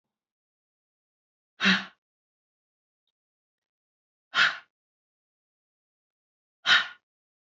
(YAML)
exhalation_length: 7.6 s
exhalation_amplitude: 13350
exhalation_signal_mean_std_ratio: 0.21
survey_phase: beta (2021-08-13 to 2022-03-07)
age: 18-44
gender: Female
wearing_mask: 'No'
symptom_cough_any: true
symptom_new_continuous_cough: true
symptom_runny_or_blocked_nose: true
symptom_sore_throat: true
symptom_fatigue: true
symptom_fever_high_temperature: true
symptom_onset: 3 days
smoker_status: Ex-smoker
respiratory_condition_asthma: false
respiratory_condition_other: false
recruitment_source: Test and Trace
submission_delay: 2 days
covid_test_result: Positive
covid_test_method: RT-qPCR
covid_ct_value: 23.5
covid_ct_gene: N gene